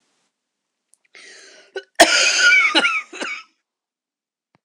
{"cough_length": "4.6 s", "cough_amplitude": 26028, "cough_signal_mean_std_ratio": 0.4, "survey_phase": "beta (2021-08-13 to 2022-03-07)", "age": "45-64", "gender": "Female", "wearing_mask": "No", "symptom_cough_any": true, "symptom_new_continuous_cough": true, "symptom_runny_or_blocked_nose": true, "symptom_shortness_of_breath": true, "symptom_fatigue": true, "symptom_headache": true, "symptom_change_to_sense_of_smell_or_taste": true, "symptom_onset": "3 days", "smoker_status": "Never smoked", "respiratory_condition_asthma": true, "respiratory_condition_other": false, "recruitment_source": "Test and Trace", "submission_delay": "2 days", "covid_test_result": "Positive", "covid_test_method": "RT-qPCR", "covid_ct_value": 23.2, "covid_ct_gene": "ORF1ab gene"}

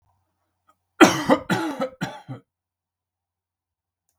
{"cough_length": "4.2 s", "cough_amplitude": 32768, "cough_signal_mean_std_ratio": 0.27, "survey_phase": "beta (2021-08-13 to 2022-03-07)", "age": "65+", "gender": "Male", "wearing_mask": "No", "symptom_none": true, "smoker_status": "Never smoked", "respiratory_condition_asthma": false, "respiratory_condition_other": false, "recruitment_source": "REACT", "submission_delay": "1 day", "covid_test_result": "Negative", "covid_test_method": "RT-qPCR"}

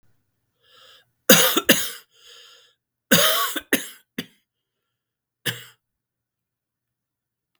{"cough_length": "7.6 s", "cough_amplitude": 32768, "cough_signal_mean_std_ratio": 0.28, "survey_phase": "beta (2021-08-13 to 2022-03-07)", "age": "65+", "gender": "Male", "wearing_mask": "No", "symptom_cough_any": true, "symptom_runny_or_blocked_nose": true, "symptom_onset": "3 days", "smoker_status": "Never smoked", "respiratory_condition_asthma": false, "respiratory_condition_other": false, "recruitment_source": "Test and Trace", "submission_delay": "2 days", "covid_test_result": "Positive", "covid_test_method": "RT-qPCR", "covid_ct_value": 16.2, "covid_ct_gene": "ORF1ab gene", "covid_ct_mean": 16.3, "covid_viral_load": "4400000 copies/ml", "covid_viral_load_category": "High viral load (>1M copies/ml)"}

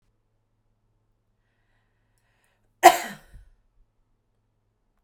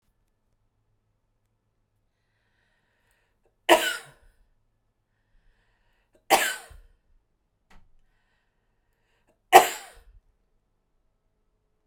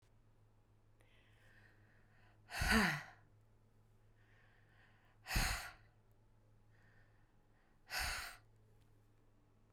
{"cough_length": "5.0 s", "cough_amplitude": 32768, "cough_signal_mean_std_ratio": 0.13, "three_cough_length": "11.9 s", "three_cough_amplitude": 32768, "three_cough_signal_mean_std_ratio": 0.16, "exhalation_length": "9.7 s", "exhalation_amplitude": 3238, "exhalation_signal_mean_std_ratio": 0.32, "survey_phase": "beta (2021-08-13 to 2022-03-07)", "age": "45-64", "gender": "Female", "wearing_mask": "No", "symptom_fatigue": true, "symptom_other": true, "smoker_status": "Never smoked", "respiratory_condition_asthma": false, "respiratory_condition_other": false, "recruitment_source": "REACT", "submission_delay": "2 days", "covid_test_result": "Negative", "covid_test_method": "RT-qPCR"}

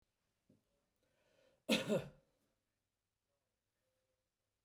{"cough_length": "4.6 s", "cough_amplitude": 2775, "cough_signal_mean_std_ratio": 0.21, "survey_phase": "beta (2021-08-13 to 2022-03-07)", "age": "65+", "gender": "Male", "wearing_mask": "No", "symptom_none": true, "smoker_status": "Never smoked", "respiratory_condition_asthma": false, "respiratory_condition_other": false, "recruitment_source": "REACT", "submission_delay": "3 days", "covid_test_result": "Negative", "covid_test_method": "RT-qPCR", "influenza_a_test_result": "Negative", "influenza_b_test_result": "Negative"}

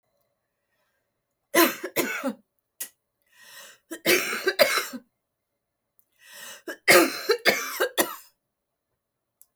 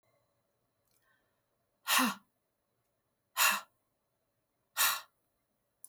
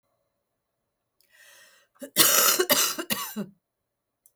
{"three_cough_length": "9.6 s", "three_cough_amplitude": 21814, "three_cough_signal_mean_std_ratio": 0.35, "exhalation_length": "5.9 s", "exhalation_amplitude": 7308, "exhalation_signal_mean_std_ratio": 0.27, "cough_length": "4.4 s", "cough_amplitude": 22838, "cough_signal_mean_std_ratio": 0.37, "survey_phase": "beta (2021-08-13 to 2022-03-07)", "age": "65+", "gender": "Female", "wearing_mask": "No", "symptom_cough_any": true, "symptom_fatigue": true, "symptom_onset": "12 days", "smoker_status": "Never smoked", "respiratory_condition_asthma": false, "respiratory_condition_other": false, "recruitment_source": "REACT", "submission_delay": "1 day", "covid_test_result": "Negative", "covid_test_method": "RT-qPCR", "influenza_a_test_result": "Negative", "influenza_b_test_result": "Negative"}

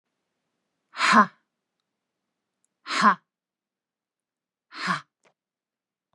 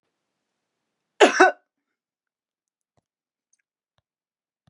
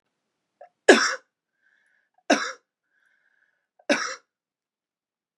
{"exhalation_length": "6.1 s", "exhalation_amplitude": 20296, "exhalation_signal_mean_std_ratio": 0.24, "cough_length": "4.7 s", "cough_amplitude": 30621, "cough_signal_mean_std_ratio": 0.17, "three_cough_length": "5.4 s", "three_cough_amplitude": 32701, "three_cough_signal_mean_std_ratio": 0.22, "survey_phase": "beta (2021-08-13 to 2022-03-07)", "age": "45-64", "gender": "Female", "wearing_mask": "No", "symptom_none": true, "smoker_status": "Never smoked", "respiratory_condition_asthma": false, "respiratory_condition_other": false, "recruitment_source": "REACT", "submission_delay": "3 days", "covid_test_result": "Negative", "covid_test_method": "RT-qPCR", "influenza_a_test_result": "Negative", "influenza_b_test_result": "Negative"}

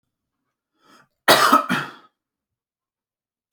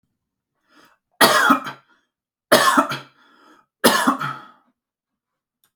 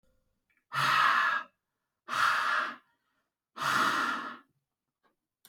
{"cough_length": "3.5 s", "cough_amplitude": 32767, "cough_signal_mean_std_ratio": 0.28, "three_cough_length": "5.8 s", "three_cough_amplitude": 32768, "three_cough_signal_mean_std_ratio": 0.36, "exhalation_length": "5.5 s", "exhalation_amplitude": 6754, "exhalation_signal_mean_std_ratio": 0.52, "survey_phase": "alpha (2021-03-01 to 2021-08-12)", "age": "18-44", "gender": "Male", "wearing_mask": "No", "symptom_none": true, "smoker_status": "Never smoked", "respiratory_condition_asthma": false, "respiratory_condition_other": false, "recruitment_source": "REACT", "submission_delay": "2 days", "covid_test_result": "Negative", "covid_test_method": "RT-qPCR"}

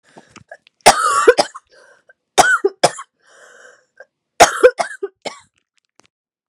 {"three_cough_length": "6.5 s", "three_cough_amplitude": 32768, "three_cough_signal_mean_std_ratio": 0.32, "survey_phase": "beta (2021-08-13 to 2022-03-07)", "age": "45-64", "gender": "Female", "wearing_mask": "No", "symptom_cough_any": true, "symptom_new_continuous_cough": true, "symptom_runny_or_blocked_nose": true, "symptom_change_to_sense_of_smell_or_taste": true, "symptom_loss_of_taste": true, "symptom_onset": "2 days", "smoker_status": "Never smoked", "respiratory_condition_asthma": true, "respiratory_condition_other": false, "recruitment_source": "Test and Trace", "submission_delay": "1 day", "covid_test_result": "Positive", "covid_test_method": "RT-qPCR", "covid_ct_value": 15.6, "covid_ct_gene": "ORF1ab gene", "covid_ct_mean": 16.0, "covid_viral_load": "5500000 copies/ml", "covid_viral_load_category": "High viral load (>1M copies/ml)"}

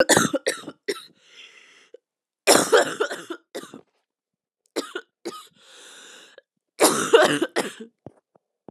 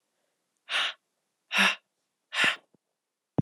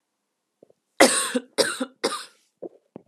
{"cough_length": "8.7 s", "cough_amplitude": 27636, "cough_signal_mean_std_ratio": 0.35, "exhalation_length": "3.4 s", "exhalation_amplitude": 9621, "exhalation_signal_mean_std_ratio": 0.34, "three_cough_length": "3.1 s", "three_cough_amplitude": 32767, "three_cough_signal_mean_std_ratio": 0.33, "survey_phase": "beta (2021-08-13 to 2022-03-07)", "age": "18-44", "gender": "Female", "wearing_mask": "No", "symptom_cough_any": true, "symptom_new_continuous_cough": true, "symptom_runny_or_blocked_nose": true, "symptom_shortness_of_breath": true, "symptom_sore_throat": true, "symptom_abdominal_pain": true, "symptom_fatigue": true, "symptom_fever_high_temperature": true, "symptom_headache": true, "symptom_change_to_sense_of_smell_or_taste": true, "symptom_other": true, "smoker_status": "Current smoker (1 to 10 cigarettes per day)", "respiratory_condition_asthma": false, "respiratory_condition_other": false, "recruitment_source": "Test and Trace", "submission_delay": "2 days", "covid_test_result": "Positive", "covid_test_method": "LFT"}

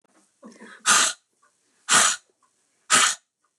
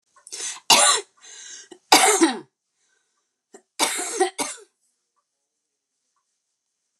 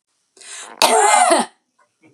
{"exhalation_length": "3.6 s", "exhalation_amplitude": 21466, "exhalation_signal_mean_std_ratio": 0.38, "three_cough_length": "7.0 s", "three_cough_amplitude": 32236, "three_cough_signal_mean_std_ratio": 0.33, "cough_length": "2.1 s", "cough_amplitude": 32768, "cough_signal_mean_std_ratio": 0.5, "survey_phase": "beta (2021-08-13 to 2022-03-07)", "age": "45-64", "gender": "Female", "wearing_mask": "No", "symptom_none": true, "smoker_status": "Ex-smoker", "respiratory_condition_asthma": false, "respiratory_condition_other": false, "recruitment_source": "REACT", "submission_delay": "1 day", "covid_test_result": "Negative", "covid_test_method": "RT-qPCR", "influenza_a_test_result": "Negative", "influenza_b_test_result": "Negative"}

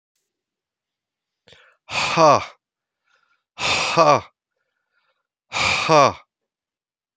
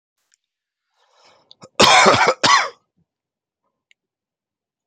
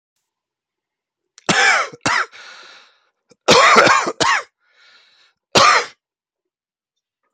{"exhalation_length": "7.2 s", "exhalation_amplitude": 30829, "exhalation_signal_mean_std_ratio": 0.35, "cough_length": "4.9 s", "cough_amplitude": 32768, "cough_signal_mean_std_ratio": 0.32, "three_cough_length": "7.3 s", "three_cough_amplitude": 32768, "three_cough_signal_mean_std_ratio": 0.39, "survey_phase": "beta (2021-08-13 to 2022-03-07)", "age": "45-64", "gender": "Male", "wearing_mask": "No", "symptom_cough_any": true, "symptom_runny_or_blocked_nose": true, "symptom_sore_throat": true, "symptom_other": true, "smoker_status": "Never smoked", "respiratory_condition_asthma": false, "respiratory_condition_other": false, "recruitment_source": "REACT", "submission_delay": "0 days", "covid_test_result": "Negative", "covid_test_method": "RT-qPCR"}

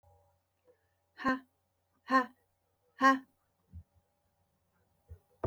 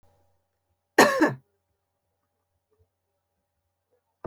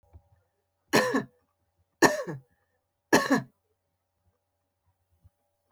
{"exhalation_length": "5.5 s", "exhalation_amplitude": 6488, "exhalation_signal_mean_std_ratio": 0.24, "cough_length": "4.3 s", "cough_amplitude": 25987, "cough_signal_mean_std_ratio": 0.21, "three_cough_length": "5.7 s", "three_cough_amplitude": 21716, "three_cough_signal_mean_std_ratio": 0.27, "survey_phase": "beta (2021-08-13 to 2022-03-07)", "age": "45-64", "gender": "Female", "wearing_mask": "No", "symptom_none": true, "smoker_status": "Never smoked", "respiratory_condition_asthma": false, "respiratory_condition_other": false, "recruitment_source": "Test and Trace", "submission_delay": "1 day", "covid_test_result": "Negative", "covid_test_method": "ePCR"}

